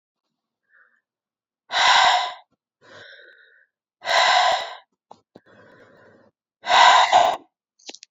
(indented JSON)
{
  "exhalation_length": "8.1 s",
  "exhalation_amplitude": 26482,
  "exhalation_signal_mean_std_ratio": 0.39,
  "survey_phase": "beta (2021-08-13 to 2022-03-07)",
  "age": "18-44",
  "gender": "Female",
  "wearing_mask": "No",
  "symptom_cough_any": true,
  "symptom_runny_or_blocked_nose": true,
  "symptom_shortness_of_breath": true,
  "symptom_headache": true,
  "symptom_onset": "2 days",
  "smoker_status": "Ex-smoker",
  "respiratory_condition_asthma": false,
  "respiratory_condition_other": false,
  "recruitment_source": "Test and Trace",
  "submission_delay": "0 days",
  "covid_test_result": "Positive",
  "covid_test_method": "LAMP"
}